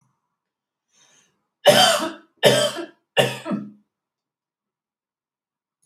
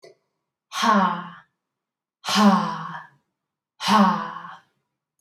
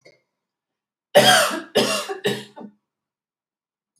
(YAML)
three_cough_length: 5.9 s
three_cough_amplitude: 28534
three_cough_signal_mean_std_ratio: 0.32
exhalation_length: 5.2 s
exhalation_amplitude: 18648
exhalation_signal_mean_std_ratio: 0.43
cough_length: 4.0 s
cough_amplitude: 28955
cough_signal_mean_std_ratio: 0.36
survey_phase: alpha (2021-03-01 to 2021-08-12)
age: 18-44
gender: Female
wearing_mask: 'No'
symptom_none: true
smoker_status: Ex-smoker
respiratory_condition_asthma: false
respiratory_condition_other: false
recruitment_source: REACT
submission_delay: 1 day
covid_test_result: Negative
covid_test_method: RT-qPCR